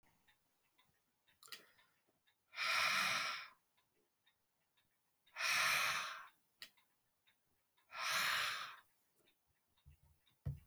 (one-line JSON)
{"exhalation_length": "10.7 s", "exhalation_amplitude": 2066, "exhalation_signal_mean_std_ratio": 0.41, "survey_phase": "alpha (2021-03-01 to 2021-08-12)", "age": "45-64", "gender": "Male", "wearing_mask": "No", "symptom_none": true, "smoker_status": "Never smoked", "respiratory_condition_asthma": false, "respiratory_condition_other": false, "recruitment_source": "REACT", "submission_delay": "1 day", "covid_test_result": "Negative", "covid_test_method": "RT-qPCR"}